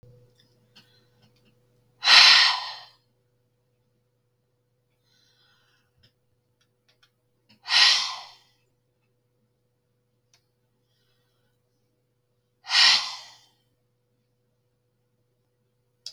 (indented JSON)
{
  "exhalation_length": "16.1 s",
  "exhalation_amplitude": 32768,
  "exhalation_signal_mean_std_ratio": 0.22,
  "survey_phase": "beta (2021-08-13 to 2022-03-07)",
  "age": "45-64",
  "gender": "Female",
  "wearing_mask": "No",
  "symptom_none": true,
  "smoker_status": "Ex-smoker",
  "respiratory_condition_asthma": false,
  "respiratory_condition_other": false,
  "recruitment_source": "REACT",
  "submission_delay": "1 day",
  "covid_test_result": "Negative",
  "covid_test_method": "RT-qPCR"
}